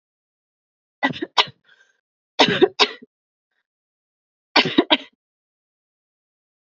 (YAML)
three_cough_length: 6.7 s
three_cough_amplitude: 31030
three_cough_signal_mean_std_ratio: 0.25
survey_phase: beta (2021-08-13 to 2022-03-07)
age: 18-44
gender: Female
wearing_mask: 'No'
symptom_cough_any: true
symptom_runny_or_blocked_nose: true
symptom_shortness_of_breath: true
symptom_onset: 5 days
smoker_status: Never smoked
respiratory_condition_asthma: false
respiratory_condition_other: false
recruitment_source: Test and Trace
submission_delay: 2 days
covid_test_result: Positive
covid_test_method: RT-qPCR
covid_ct_value: 29.5
covid_ct_gene: N gene